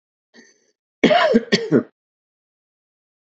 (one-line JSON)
{"cough_length": "3.2 s", "cough_amplitude": 28190, "cough_signal_mean_std_ratio": 0.35, "survey_phase": "beta (2021-08-13 to 2022-03-07)", "age": "45-64", "gender": "Male", "wearing_mask": "No", "symptom_cough_any": true, "symptom_fatigue": true, "smoker_status": "Ex-smoker", "respiratory_condition_asthma": false, "respiratory_condition_other": false, "recruitment_source": "Test and Trace", "submission_delay": "2 days", "covid_test_result": "Positive", "covid_test_method": "RT-qPCR", "covid_ct_value": 28.6, "covid_ct_gene": "ORF1ab gene"}